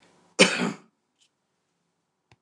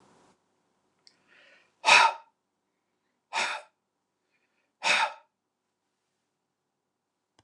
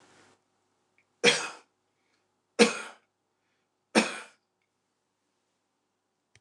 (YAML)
cough_length: 2.4 s
cough_amplitude: 28010
cough_signal_mean_std_ratio: 0.24
exhalation_length: 7.4 s
exhalation_amplitude: 19847
exhalation_signal_mean_std_ratio: 0.23
three_cough_length: 6.4 s
three_cough_amplitude: 19504
three_cough_signal_mean_std_ratio: 0.21
survey_phase: beta (2021-08-13 to 2022-03-07)
age: 65+
gender: Male
wearing_mask: 'No'
symptom_none: true
smoker_status: Ex-smoker
respiratory_condition_asthma: false
respiratory_condition_other: false
recruitment_source: REACT
submission_delay: 2 days
covid_test_result: Negative
covid_test_method: RT-qPCR
influenza_a_test_result: Negative
influenza_b_test_result: Negative